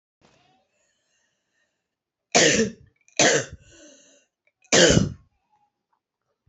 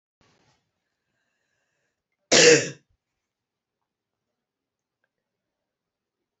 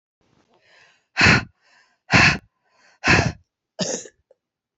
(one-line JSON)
{"three_cough_length": "6.5 s", "three_cough_amplitude": 25556, "three_cough_signal_mean_std_ratio": 0.31, "cough_length": "6.4 s", "cough_amplitude": 25245, "cough_signal_mean_std_ratio": 0.18, "exhalation_length": "4.8 s", "exhalation_amplitude": 27029, "exhalation_signal_mean_std_ratio": 0.34, "survey_phase": "alpha (2021-03-01 to 2021-08-12)", "age": "18-44", "gender": "Female", "wearing_mask": "No", "symptom_cough_any": true, "symptom_shortness_of_breath": true, "symptom_fatigue": true, "symptom_onset": "5 days", "smoker_status": "Never smoked", "respiratory_condition_asthma": true, "respiratory_condition_other": false, "recruitment_source": "REACT", "submission_delay": "1 day", "covid_test_result": "Negative", "covid_test_method": "RT-qPCR"}